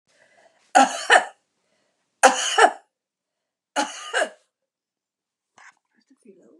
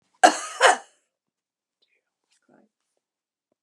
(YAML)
three_cough_length: 6.6 s
three_cough_amplitude: 32258
three_cough_signal_mean_std_ratio: 0.28
cough_length: 3.6 s
cough_amplitude: 32151
cough_signal_mean_std_ratio: 0.21
survey_phase: beta (2021-08-13 to 2022-03-07)
age: 65+
gender: Female
wearing_mask: 'No'
symptom_shortness_of_breath: true
smoker_status: Ex-smoker
respiratory_condition_asthma: false
respiratory_condition_other: true
recruitment_source: REACT
submission_delay: 12 days
covid_test_result: Negative
covid_test_method: RT-qPCR
influenza_a_test_result: Negative
influenza_b_test_result: Negative